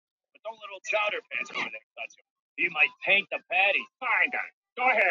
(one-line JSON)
{"three_cough_length": "5.1 s", "three_cough_amplitude": 12206, "three_cough_signal_mean_std_ratio": 0.55, "survey_phase": "beta (2021-08-13 to 2022-03-07)", "age": "18-44", "gender": "Male", "wearing_mask": "No", "symptom_cough_any": true, "symptom_new_continuous_cough": true, "symptom_runny_or_blocked_nose": true, "symptom_sore_throat": true, "symptom_fatigue": true, "symptom_fever_high_temperature": true, "symptom_headache": true, "smoker_status": "Never smoked", "respiratory_condition_asthma": false, "respiratory_condition_other": false, "recruitment_source": "Test and Trace", "submission_delay": "2 days", "covid_test_result": "Positive", "covid_test_method": "RT-qPCR"}